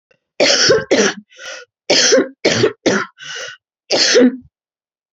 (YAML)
cough_length: 5.1 s
cough_amplitude: 32767
cough_signal_mean_std_ratio: 0.56
survey_phase: beta (2021-08-13 to 2022-03-07)
age: 65+
gender: Female
wearing_mask: 'No'
symptom_new_continuous_cough: true
symptom_runny_or_blocked_nose: true
symptom_fatigue: true
symptom_fever_high_temperature: true
symptom_onset: 5 days
smoker_status: Never smoked
respiratory_condition_asthma: false
respiratory_condition_other: false
recruitment_source: Test and Trace
submission_delay: 2 days
covid_test_result: Positive
covid_test_method: ePCR